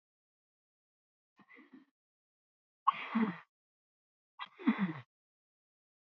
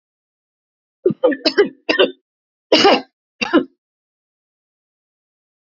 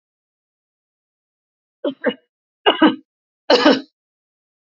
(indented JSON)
{
  "exhalation_length": "6.1 s",
  "exhalation_amplitude": 4987,
  "exhalation_signal_mean_std_ratio": 0.25,
  "cough_length": "5.6 s",
  "cough_amplitude": 29434,
  "cough_signal_mean_std_ratio": 0.33,
  "three_cough_length": "4.6 s",
  "three_cough_amplitude": 28940,
  "three_cough_signal_mean_std_ratio": 0.29,
  "survey_phase": "beta (2021-08-13 to 2022-03-07)",
  "age": "65+",
  "gender": "Female",
  "wearing_mask": "No",
  "symptom_cough_any": true,
  "smoker_status": "Ex-smoker",
  "respiratory_condition_asthma": true,
  "respiratory_condition_other": false,
  "recruitment_source": "REACT",
  "submission_delay": "3 days",
  "covid_test_result": "Negative",
  "covid_test_method": "RT-qPCR",
  "influenza_a_test_result": "Negative",
  "influenza_b_test_result": "Negative"
}